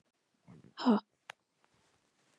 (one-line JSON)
{"exhalation_length": "2.4 s", "exhalation_amplitude": 5088, "exhalation_signal_mean_std_ratio": 0.23, "survey_phase": "beta (2021-08-13 to 2022-03-07)", "age": "18-44", "gender": "Female", "wearing_mask": "No", "symptom_runny_or_blocked_nose": true, "smoker_status": "Never smoked", "respiratory_condition_asthma": false, "respiratory_condition_other": false, "recruitment_source": "REACT", "submission_delay": "2 days", "covid_test_result": "Negative", "covid_test_method": "RT-qPCR", "influenza_a_test_result": "Negative", "influenza_b_test_result": "Negative"}